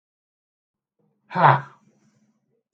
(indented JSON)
{
  "exhalation_length": "2.7 s",
  "exhalation_amplitude": 27611,
  "exhalation_signal_mean_std_ratio": 0.23,
  "survey_phase": "beta (2021-08-13 to 2022-03-07)",
  "age": "45-64",
  "gender": "Male",
  "wearing_mask": "No",
  "symptom_fatigue": true,
  "smoker_status": "Never smoked",
  "respiratory_condition_asthma": false,
  "respiratory_condition_other": true,
  "recruitment_source": "REACT",
  "submission_delay": "0 days",
  "covid_test_result": "Negative",
  "covid_test_method": "RT-qPCR"
}